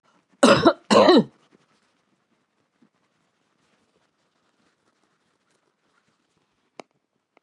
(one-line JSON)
{"cough_length": "7.4 s", "cough_amplitude": 29286, "cough_signal_mean_std_ratio": 0.23, "survey_phase": "beta (2021-08-13 to 2022-03-07)", "age": "65+", "gender": "Male", "wearing_mask": "No", "symptom_cough_any": true, "symptom_runny_or_blocked_nose": true, "symptom_sore_throat": true, "smoker_status": "Never smoked", "respiratory_condition_asthma": false, "respiratory_condition_other": false, "recruitment_source": "Test and Trace", "submission_delay": "3 days", "covid_test_result": "Positive", "covid_test_method": "LFT"}